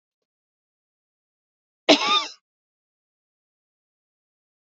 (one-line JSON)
{"cough_length": "4.8 s", "cough_amplitude": 24406, "cough_signal_mean_std_ratio": 0.19, "survey_phase": "beta (2021-08-13 to 2022-03-07)", "age": "18-44", "gender": "Female", "wearing_mask": "No", "symptom_none": true, "smoker_status": "Never smoked", "respiratory_condition_asthma": false, "respiratory_condition_other": false, "recruitment_source": "REACT", "submission_delay": "1 day", "covid_test_result": "Negative", "covid_test_method": "RT-qPCR", "influenza_a_test_result": "Unknown/Void", "influenza_b_test_result": "Unknown/Void"}